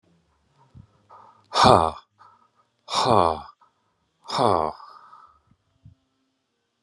{"exhalation_length": "6.8 s", "exhalation_amplitude": 31232, "exhalation_signal_mean_std_ratio": 0.28, "survey_phase": "beta (2021-08-13 to 2022-03-07)", "age": "45-64", "gender": "Male", "wearing_mask": "No", "symptom_runny_or_blocked_nose": true, "symptom_abdominal_pain": true, "symptom_fatigue": true, "symptom_other": true, "symptom_onset": "10 days", "smoker_status": "Never smoked", "respiratory_condition_asthma": false, "respiratory_condition_other": false, "recruitment_source": "REACT", "submission_delay": "1 day", "covid_test_result": "Negative", "covid_test_method": "RT-qPCR", "covid_ct_value": 43.0, "covid_ct_gene": "N gene"}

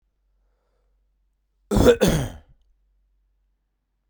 {"three_cough_length": "4.1 s", "three_cough_amplitude": 28106, "three_cough_signal_mean_std_ratio": 0.28, "survey_phase": "beta (2021-08-13 to 2022-03-07)", "age": "18-44", "gender": "Male", "wearing_mask": "No", "symptom_cough_any": true, "symptom_runny_or_blocked_nose": true, "symptom_shortness_of_breath": true, "symptom_fatigue": true, "symptom_headache": true, "symptom_onset": "2 days", "smoker_status": "Ex-smoker", "respiratory_condition_asthma": false, "respiratory_condition_other": false, "recruitment_source": "Test and Trace", "submission_delay": "2 days", "covid_test_result": "Positive", "covid_test_method": "RT-qPCR", "covid_ct_value": 23.1, "covid_ct_gene": "N gene"}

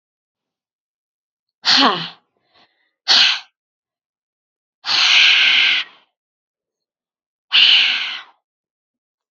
{"exhalation_length": "9.3 s", "exhalation_amplitude": 30323, "exhalation_signal_mean_std_ratio": 0.4, "survey_phase": "beta (2021-08-13 to 2022-03-07)", "age": "18-44", "gender": "Female", "wearing_mask": "No", "symptom_cough_any": true, "symptom_sore_throat": true, "symptom_diarrhoea": true, "symptom_fatigue": true, "symptom_fever_high_temperature": true, "smoker_status": "Ex-smoker", "respiratory_condition_asthma": false, "respiratory_condition_other": false, "recruitment_source": "Test and Trace", "submission_delay": "2 days", "covid_test_result": "Positive", "covid_test_method": "RT-qPCR", "covid_ct_value": 25.3, "covid_ct_gene": "ORF1ab gene"}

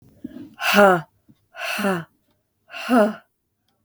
{"exhalation_length": "3.8 s", "exhalation_amplitude": 32766, "exhalation_signal_mean_std_ratio": 0.41, "survey_phase": "beta (2021-08-13 to 2022-03-07)", "age": "18-44", "gender": "Female", "wearing_mask": "No", "symptom_cough_any": true, "symptom_runny_or_blocked_nose": true, "symptom_sore_throat": true, "symptom_abdominal_pain": true, "symptom_fatigue": true, "symptom_headache": true, "symptom_onset": "3 days", "smoker_status": "Never smoked", "respiratory_condition_asthma": false, "respiratory_condition_other": false, "recruitment_source": "REACT", "submission_delay": "1 day", "covid_test_result": "Negative", "covid_test_method": "RT-qPCR", "influenza_a_test_result": "Unknown/Void", "influenza_b_test_result": "Unknown/Void"}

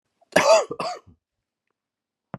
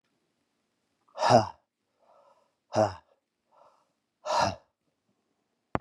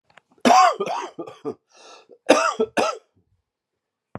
{"cough_length": "2.4 s", "cough_amplitude": 30109, "cough_signal_mean_std_ratio": 0.32, "exhalation_length": "5.8 s", "exhalation_amplitude": 15705, "exhalation_signal_mean_std_ratio": 0.26, "three_cough_length": "4.2 s", "three_cough_amplitude": 31366, "three_cough_signal_mean_std_ratio": 0.39, "survey_phase": "beta (2021-08-13 to 2022-03-07)", "age": "45-64", "gender": "Male", "wearing_mask": "No", "symptom_cough_any": true, "symptom_runny_or_blocked_nose": true, "symptom_fatigue": true, "symptom_change_to_sense_of_smell_or_taste": true, "smoker_status": "Never smoked", "respiratory_condition_asthma": false, "respiratory_condition_other": false, "recruitment_source": "Test and Trace", "submission_delay": "3 days", "covid_test_result": "Positive", "covid_test_method": "RT-qPCR", "covid_ct_value": 19.2, "covid_ct_gene": "ORF1ab gene", "covid_ct_mean": 19.7, "covid_viral_load": "350000 copies/ml", "covid_viral_load_category": "Low viral load (10K-1M copies/ml)"}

